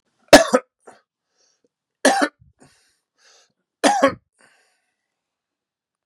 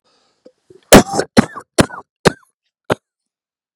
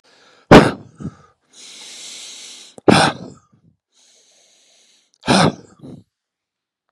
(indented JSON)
{
  "three_cough_length": "6.1 s",
  "three_cough_amplitude": 32768,
  "three_cough_signal_mean_std_ratio": 0.23,
  "cough_length": "3.8 s",
  "cough_amplitude": 32768,
  "cough_signal_mean_std_ratio": 0.25,
  "exhalation_length": "6.9 s",
  "exhalation_amplitude": 32768,
  "exhalation_signal_mean_std_ratio": 0.26,
  "survey_phase": "beta (2021-08-13 to 2022-03-07)",
  "age": "45-64",
  "gender": "Male",
  "wearing_mask": "No",
  "symptom_cough_any": true,
  "symptom_new_continuous_cough": true,
  "symptom_runny_or_blocked_nose": true,
  "symptom_sore_throat": true,
  "symptom_fatigue": true,
  "symptom_fever_high_temperature": true,
  "symptom_headache": true,
  "symptom_onset": "4 days",
  "smoker_status": "Never smoked",
  "respiratory_condition_asthma": true,
  "respiratory_condition_other": false,
  "recruitment_source": "Test and Trace",
  "submission_delay": "2 days",
  "covid_test_result": "Positive",
  "covid_test_method": "RT-qPCR",
  "covid_ct_value": 15.2,
  "covid_ct_gene": "ORF1ab gene",
  "covid_ct_mean": 18.5,
  "covid_viral_load": "830000 copies/ml",
  "covid_viral_load_category": "Low viral load (10K-1M copies/ml)"
}